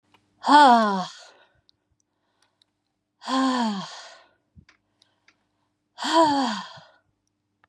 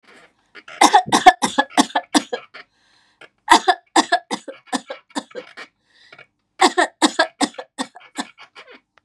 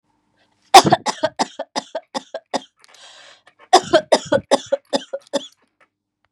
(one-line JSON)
{"exhalation_length": "7.7 s", "exhalation_amplitude": 26274, "exhalation_signal_mean_std_ratio": 0.35, "three_cough_length": "9.0 s", "three_cough_amplitude": 32768, "three_cough_signal_mean_std_ratio": 0.32, "cough_length": "6.3 s", "cough_amplitude": 32768, "cough_signal_mean_std_ratio": 0.29, "survey_phase": "beta (2021-08-13 to 2022-03-07)", "age": "45-64", "gender": "Female", "wearing_mask": "No", "symptom_none": true, "smoker_status": "Ex-smoker", "respiratory_condition_asthma": false, "respiratory_condition_other": false, "recruitment_source": "REACT", "submission_delay": "0 days", "covid_test_result": "Negative", "covid_test_method": "RT-qPCR", "influenza_a_test_result": "Negative", "influenza_b_test_result": "Negative"}